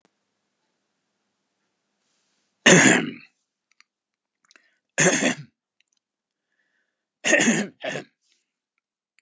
{"cough_length": "9.2 s", "cough_amplitude": 30770, "cough_signal_mean_std_ratio": 0.28, "survey_phase": "alpha (2021-03-01 to 2021-08-12)", "age": "65+", "gender": "Male", "wearing_mask": "No", "symptom_none": true, "smoker_status": "Never smoked", "respiratory_condition_asthma": false, "respiratory_condition_other": true, "recruitment_source": "Test and Trace", "submission_delay": "2 days", "covid_test_result": "Positive", "covid_test_method": "RT-qPCR", "covid_ct_value": 34.1, "covid_ct_gene": "ORF1ab gene"}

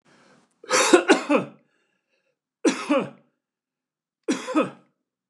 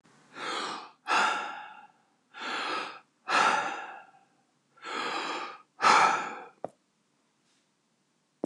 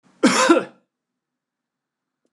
{"three_cough_length": "5.3 s", "three_cough_amplitude": 28038, "three_cough_signal_mean_std_ratio": 0.37, "exhalation_length": "8.5 s", "exhalation_amplitude": 12538, "exhalation_signal_mean_std_ratio": 0.45, "cough_length": "2.3 s", "cough_amplitude": 26775, "cough_signal_mean_std_ratio": 0.32, "survey_phase": "beta (2021-08-13 to 2022-03-07)", "age": "65+", "gender": "Male", "wearing_mask": "No", "symptom_none": true, "smoker_status": "Never smoked", "respiratory_condition_asthma": false, "respiratory_condition_other": false, "recruitment_source": "REACT", "submission_delay": "1 day", "covid_test_result": "Negative", "covid_test_method": "RT-qPCR", "influenza_a_test_result": "Negative", "influenza_b_test_result": "Negative"}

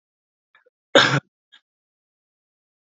{"cough_length": "3.0 s", "cough_amplitude": 29609, "cough_signal_mean_std_ratio": 0.2, "survey_phase": "beta (2021-08-13 to 2022-03-07)", "age": "18-44", "gender": "Male", "wearing_mask": "No", "symptom_none": true, "smoker_status": "Current smoker (1 to 10 cigarettes per day)", "respiratory_condition_asthma": false, "respiratory_condition_other": false, "recruitment_source": "REACT", "submission_delay": "1 day", "covid_test_result": "Negative", "covid_test_method": "RT-qPCR", "influenza_a_test_result": "Unknown/Void", "influenza_b_test_result": "Unknown/Void"}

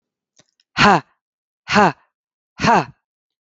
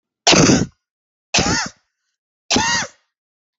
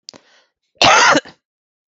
{"exhalation_length": "3.4 s", "exhalation_amplitude": 32768, "exhalation_signal_mean_std_ratio": 0.34, "three_cough_length": "3.6 s", "three_cough_amplitude": 32768, "three_cough_signal_mean_std_ratio": 0.43, "cough_length": "1.9 s", "cough_amplitude": 32766, "cough_signal_mean_std_ratio": 0.39, "survey_phase": "beta (2021-08-13 to 2022-03-07)", "age": "45-64", "gender": "Female", "wearing_mask": "No", "symptom_new_continuous_cough": true, "symptom_onset": "9 days", "smoker_status": "Ex-smoker", "respiratory_condition_asthma": false, "respiratory_condition_other": false, "recruitment_source": "REACT", "submission_delay": "2 days", "covid_test_result": "Positive", "covid_test_method": "RT-qPCR", "covid_ct_value": 24.0, "covid_ct_gene": "E gene", "influenza_a_test_result": "Negative", "influenza_b_test_result": "Negative"}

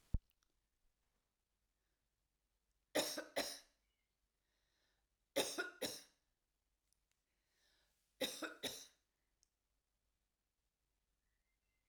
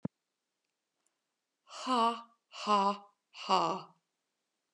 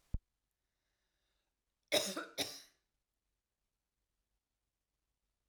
{"three_cough_length": "11.9 s", "three_cough_amplitude": 2303, "three_cough_signal_mean_std_ratio": 0.25, "exhalation_length": "4.7 s", "exhalation_amplitude": 6191, "exhalation_signal_mean_std_ratio": 0.37, "cough_length": "5.5 s", "cough_amplitude": 4805, "cough_signal_mean_std_ratio": 0.22, "survey_phase": "alpha (2021-03-01 to 2021-08-12)", "age": "45-64", "gender": "Female", "wearing_mask": "No", "symptom_none": true, "smoker_status": "Never smoked", "respiratory_condition_asthma": false, "respiratory_condition_other": false, "recruitment_source": "REACT", "submission_delay": "1 day", "covid_test_result": "Negative", "covid_test_method": "RT-qPCR"}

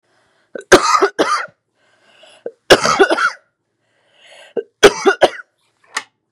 {"three_cough_length": "6.3 s", "three_cough_amplitude": 32768, "three_cough_signal_mean_std_ratio": 0.36, "survey_phase": "beta (2021-08-13 to 2022-03-07)", "age": "18-44", "gender": "Female", "wearing_mask": "No", "symptom_cough_any": true, "symptom_runny_or_blocked_nose": true, "symptom_sore_throat": true, "symptom_onset": "12 days", "smoker_status": "Never smoked", "respiratory_condition_asthma": false, "respiratory_condition_other": false, "recruitment_source": "REACT", "submission_delay": "1 day", "covid_test_result": "Negative", "covid_test_method": "RT-qPCR", "influenza_a_test_result": "Unknown/Void", "influenza_b_test_result": "Unknown/Void"}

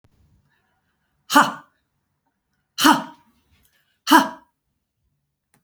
{"exhalation_length": "5.6 s", "exhalation_amplitude": 32767, "exhalation_signal_mean_std_ratio": 0.24, "survey_phase": "beta (2021-08-13 to 2022-03-07)", "age": "45-64", "gender": "Female", "wearing_mask": "No", "symptom_none": true, "smoker_status": "Never smoked", "respiratory_condition_asthma": false, "respiratory_condition_other": false, "recruitment_source": "REACT", "submission_delay": "2 days", "covid_test_result": "Negative", "covid_test_method": "RT-qPCR", "influenza_a_test_result": "Negative", "influenza_b_test_result": "Negative"}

